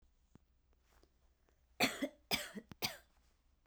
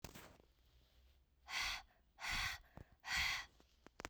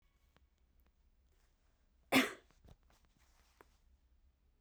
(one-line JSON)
{"three_cough_length": "3.7 s", "three_cough_amplitude": 4140, "three_cough_signal_mean_std_ratio": 0.3, "exhalation_length": "4.1 s", "exhalation_amplitude": 1635, "exhalation_signal_mean_std_ratio": 0.49, "cough_length": "4.6 s", "cough_amplitude": 4460, "cough_signal_mean_std_ratio": 0.18, "survey_phase": "beta (2021-08-13 to 2022-03-07)", "age": "18-44", "gender": "Female", "wearing_mask": "No", "symptom_none": true, "smoker_status": "Ex-smoker", "respiratory_condition_asthma": false, "respiratory_condition_other": false, "recruitment_source": "REACT", "submission_delay": "2 days", "covid_test_result": "Negative", "covid_test_method": "RT-qPCR", "influenza_a_test_result": "Negative", "influenza_b_test_result": "Negative"}